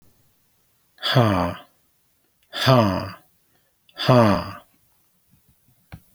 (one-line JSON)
{"exhalation_length": "6.1 s", "exhalation_amplitude": 26803, "exhalation_signal_mean_std_ratio": 0.37, "survey_phase": "beta (2021-08-13 to 2022-03-07)", "age": "65+", "gender": "Male", "wearing_mask": "No", "symptom_none": true, "smoker_status": "Never smoked", "respiratory_condition_asthma": false, "respiratory_condition_other": false, "recruitment_source": "REACT", "submission_delay": "2 days", "covid_test_result": "Negative", "covid_test_method": "RT-qPCR"}